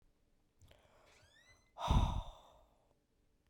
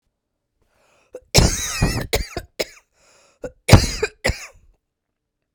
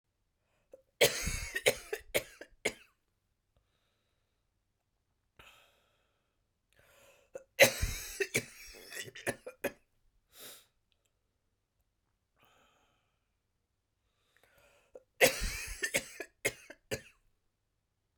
{
  "exhalation_length": "3.5 s",
  "exhalation_amplitude": 3666,
  "exhalation_signal_mean_std_ratio": 0.29,
  "cough_length": "5.5 s",
  "cough_amplitude": 32768,
  "cough_signal_mean_std_ratio": 0.32,
  "three_cough_length": "18.2 s",
  "three_cough_amplitude": 14975,
  "three_cough_signal_mean_std_ratio": 0.25,
  "survey_phase": "beta (2021-08-13 to 2022-03-07)",
  "age": "45-64",
  "gender": "Female",
  "wearing_mask": "No",
  "symptom_cough_any": true,
  "symptom_runny_or_blocked_nose": true,
  "symptom_sore_throat": true,
  "symptom_headache": true,
  "symptom_onset": "3 days",
  "smoker_status": "Never smoked",
  "respiratory_condition_asthma": true,
  "respiratory_condition_other": false,
  "recruitment_source": "Test and Trace",
  "submission_delay": "1 day",
  "covid_test_result": "Positive",
  "covid_test_method": "RT-qPCR",
  "covid_ct_value": 17.5,
  "covid_ct_gene": "ORF1ab gene",
  "covid_ct_mean": 18.3,
  "covid_viral_load": "1000000 copies/ml",
  "covid_viral_load_category": "Low viral load (10K-1M copies/ml)"
}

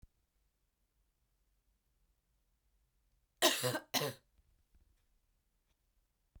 {
  "cough_length": "6.4 s",
  "cough_amplitude": 5908,
  "cough_signal_mean_std_ratio": 0.22,
  "survey_phase": "beta (2021-08-13 to 2022-03-07)",
  "age": "45-64",
  "gender": "Female",
  "wearing_mask": "No",
  "symptom_cough_any": true,
  "symptom_runny_or_blocked_nose": true,
  "symptom_sore_throat": true,
  "symptom_fatigue": true,
  "smoker_status": "Never smoked",
  "respiratory_condition_asthma": false,
  "respiratory_condition_other": false,
  "recruitment_source": "Test and Trace",
  "submission_delay": "2 days",
  "covid_test_result": "Positive",
  "covid_test_method": "RT-qPCR",
  "covid_ct_value": 16.7,
  "covid_ct_gene": "ORF1ab gene",
  "covid_ct_mean": 17.3,
  "covid_viral_load": "2100000 copies/ml",
  "covid_viral_load_category": "High viral load (>1M copies/ml)"
}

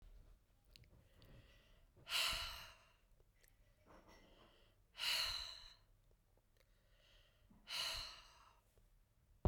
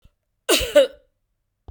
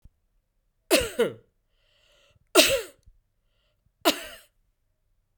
{
  "exhalation_length": "9.5 s",
  "exhalation_amplitude": 2282,
  "exhalation_signal_mean_std_ratio": 0.38,
  "cough_length": "1.7 s",
  "cough_amplitude": 25422,
  "cough_signal_mean_std_ratio": 0.33,
  "three_cough_length": "5.4 s",
  "three_cough_amplitude": 26831,
  "three_cough_signal_mean_std_ratio": 0.27,
  "survey_phase": "beta (2021-08-13 to 2022-03-07)",
  "age": "45-64",
  "gender": "Female",
  "wearing_mask": "No",
  "symptom_runny_or_blocked_nose": true,
  "symptom_headache": true,
  "symptom_change_to_sense_of_smell_or_taste": true,
  "symptom_loss_of_taste": true,
  "symptom_onset": "2 days",
  "smoker_status": "Never smoked",
  "respiratory_condition_asthma": false,
  "respiratory_condition_other": false,
  "recruitment_source": "Test and Trace",
  "submission_delay": "1 day",
  "covid_test_result": "Positive",
  "covid_test_method": "RT-qPCR",
  "covid_ct_value": 22.2,
  "covid_ct_gene": "N gene"
}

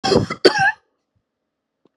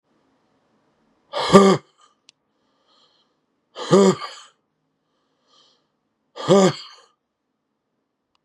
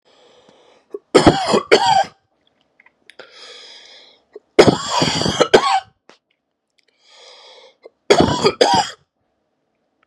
{
  "cough_length": "2.0 s",
  "cough_amplitude": 32767,
  "cough_signal_mean_std_ratio": 0.38,
  "exhalation_length": "8.4 s",
  "exhalation_amplitude": 32768,
  "exhalation_signal_mean_std_ratio": 0.26,
  "three_cough_length": "10.1 s",
  "three_cough_amplitude": 32768,
  "three_cough_signal_mean_std_ratio": 0.37,
  "survey_phase": "beta (2021-08-13 to 2022-03-07)",
  "age": "45-64",
  "gender": "Male",
  "wearing_mask": "No",
  "symptom_cough_any": true,
  "symptom_runny_or_blocked_nose": true,
  "symptom_shortness_of_breath": true,
  "symptom_sore_throat": true,
  "symptom_diarrhoea": true,
  "symptom_fatigue": true,
  "symptom_headache": true,
  "symptom_change_to_sense_of_smell_or_taste": true,
  "symptom_onset": "3 days",
  "smoker_status": "Ex-smoker",
  "respiratory_condition_asthma": false,
  "respiratory_condition_other": false,
  "recruitment_source": "Test and Trace",
  "submission_delay": "1 day",
  "covid_test_result": "Positive",
  "covid_test_method": "RT-qPCR",
  "covid_ct_value": 22.0,
  "covid_ct_gene": "ORF1ab gene"
}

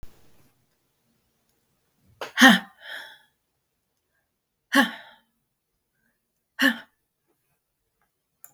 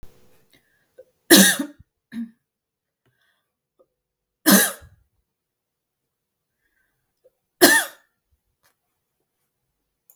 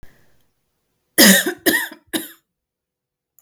{
  "exhalation_length": "8.5 s",
  "exhalation_amplitude": 32750,
  "exhalation_signal_mean_std_ratio": 0.2,
  "three_cough_length": "10.2 s",
  "three_cough_amplitude": 32768,
  "three_cough_signal_mean_std_ratio": 0.22,
  "cough_length": "3.4 s",
  "cough_amplitude": 32768,
  "cough_signal_mean_std_ratio": 0.31,
  "survey_phase": "beta (2021-08-13 to 2022-03-07)",
  "age": "45-64",
  "gender": "Female",
  "wearing_mask": "No",
  "symptom_cough_any": true,
  "symptom_runny_or_blocked_nose": true,
  "symptom_shortness_of_breath": true,
  "symptom_sore_throat": true,
  "symptom_fatigue": true,
  "symptom_headache": true,
  "symptom_change_to_sense_of_smell_or_taste": true,
  "symptom_onset": "3 days",
  "smoker_status": "Ex-smoker",
  "respiratory_condition_asthma": false,
  "respiratory_condition_other": false,
  "recruitment_source": "Test and Trace",
  "submission_delay": "2 days",
  "covid_test_result": "Positive",
  "covid_test_method": "RT-qPCR",
  "covid_ct_value": 33.8,
  "covid_ct_gene": "ORF1ab gene"
}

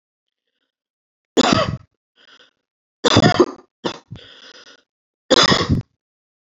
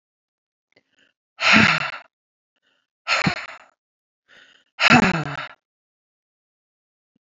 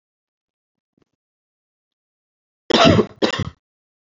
{
  "three_cough_length": "6.5 s",
  "three_cough_amplitude": 32767,
  "three_cough_signal_mean_std_ratio": 0.34,
  "exhalation_length": "7.3 s",
  "exhalation_amplitude": 27127,
  "exhalation_signal_mean_std_ratio": 0.31,
  "cough_length": "4.0 s",
  "cough_amplitude": 28292,
  "cough_signal_mean_std_ratio": 0.27,
  "survey_phase": "beta (2021-08-13 to 2022-03-07)",
  "age": "45-64",
  "gender": "Female",
  "wearing_mask": "No",
  "symptom_runny_or_blocked_nose": true,
  "smoker_status": "Current smoker (e-cigarettes or vapes only)",
  "respiratory_condition_asthma": false,
  "respiratory_condition_other": false,
  "recruitment_source": "Test and Trace",
  "submission_delay": "1 day",
  "covid_test_result": "Positive",
  "covid_test_method": "RT-qPCR",
  "covid_ct_value": 13.8,
  "covid_ct_gene": "ORF1ab gene",
  "covid_ct_mean": 14.2,
  "covid_viral_load": "22000000 copies/ml",
  "covid_viral_load_category": "High viral load (>1M copies/ml)"
}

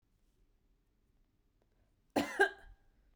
{
  "cough_length": "3.2 s",
  "cough_amplitude": 6371,
  "cough_signal_mean_std_ratio": 0.22,
  "survey_phase": "beta (2021-08-13 to 2022-03-07)",
  "age": "18-44",
  "gender": "Female",
  "wearing_mask": "No",
  "symptom_none": true,
  "smoker_status": "Never smoked",
  "respiratory_condition_asthma": false,
  "respiratory_condition_other": false,
  "recruitment_source": "REACT",
  "submission_delay": "8 days",
  "covid_test_result": "Negative",
  "covid_test_method": "RT-qPCR"
}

